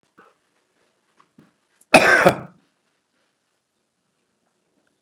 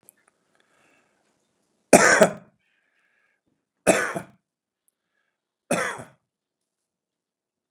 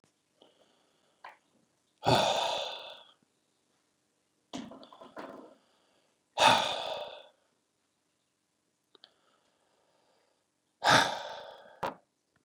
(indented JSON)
{
  "cough_length": "5.0 s",
  "cough_amplitude": 32768,
  "cough_signal_mean_std_ratio": 0.21,
  "three_cough_length": "7.7 s",
  "three_cough_amplitude": 32768,
  "three_cough_signal_mean_std_ratio": 0.22,
  "exhalation_length": "12.4 s",
  "exhalation_amplitude": 13074,
  "exhalation_signal_mean_std_ratio": 0.29,
  "survey_phase": "beta (2021-08-13 to 2022-03-07)",
  "age": "65+",
  "gender": "Male",
  "wearing_mask": "No",
  "symptom_none": true,
  "smoker_status": "Ex-smoker",
  "respiratory_condition_asthma": false,
  "respiratory_condition_other": false,
  "recruitment_source": "REACT",
  "submission_delay": "2 days",
  "covid_test_result": "Negative",
  "covid_test_method": "RT-qPCR",
  "influenza_a_test_result": "Negative",
  "influenza_b_test_result": "Negative"
}